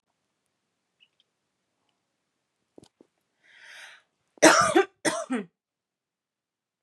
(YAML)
cough_length: 6.8 s
cough_amplitude: 28284
cough_signal_mean_std_ratio: 0.22
survey_phase: beta (2021-08-13 to 2022-03-07)
age: 18-44
gender: Female
wearing_mask: 'No'
symptom_none: true
smoker_status: Never smoked
respiratory_condition_asthma: false
respiratory_condition_other: false
recruitment_source: REACT
submission_delay: 4 days
covid_test_result: Negative
covid_test_method: RT-qPCR
influenza_a_test_result: Negative
influenza_b_test_result: Negative